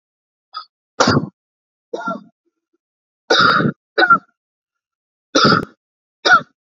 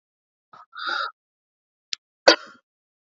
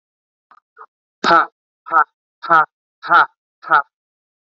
{"three_cough_length": "6.7 s", "three_cough_amplitude": 29788, "three_cough_signal_mean_std_ratio": 0.37, "cough_length": "3.2 s", "cough_amplitude": 32679, "cough_signal_mean_std_ratio": 0.2, "exhalation_length": "4.4 s", "exhalation_amplitude": 29127, "exhalation_signal_mean_std_ratio": 0.33, "survey_phase": "alpha (2021-03-01 to 2021-08-12)", "age": "18-44", "gender": "Male", "wearing_mask": "No", "symptom_none": true, "smoker_status": "Never smoked", "respiratory_condition_asthma": false, "respiratory_condition_other": false, "recruitment_source": "REACT", "submission_delay": "1 day", "covid_test_result": "Negative", "covid_test_method": "RT-qPCR"}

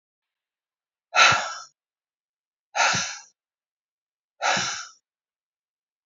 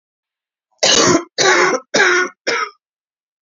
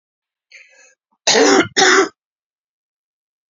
{"exhalation_length": "6.1 s", "exhalation_amplitude": 23980, "exhalation_signal_mean_std_ratio": 0.31, "three_cough_length": "3.4 s", "three_cough_amplitude": 32768, "three_cough_signal_mean_std_ratio": 0.54, "cough_length": "3.5 s", "cough_amplitude": 32551, "cough_signal_mean_std_ratio": 0.37, "survey_phase": "beta (2021-08-13 to 2022-03-07)", "age": "45-64", "gender": "Female", "wearing_mask": "No", "symptom_cough_any": true, "smoker_status": "Never smoked", "respiratory_condition_asthma": false, "respiratory_condition_other": true, "recruitment_source": "REACT", "submission_delay": "2 days", "covid_test_result": "Negative", "covid_test_method": "RT-qPCR", "influenza_a_test_result": "Negative", "influenza_b_test_result": "Negative"}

